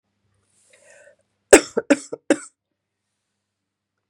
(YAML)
three_cough_length: 4.1 s
three_cough_amplitude: 32768
three_cough_signal_mean_std_ratio: 0.17
survey_phase: beta (2021-08-13 to 2022-03-07)
age: 45-64
gender: Female
wearing_mask: 'No'
symptom_cough_any: true
symptom_runny_or_blocked_nose: true
symptom_sore_throat: true
symptom_fatigue: true
symptom_fever_high_temperature: true
symptom_headache: true
symptom_onset: 4 days
smoker_status: Never smoked
respiratory_condition_asthma: false
respiratory_condition_other: false
recruitment_source: Test and Trace
submission_delay: 1 day
covid_test_result: Positive
covid_test_method: RT-qPCR
covid_ct_value: 14.3
covid_ct_gene: ORF1ab gene
covid_ct_mean: 14.5
covid_viral_load: 18000000 copies/ml
covid_viral_load_category: High viral load (>1M copies/ml)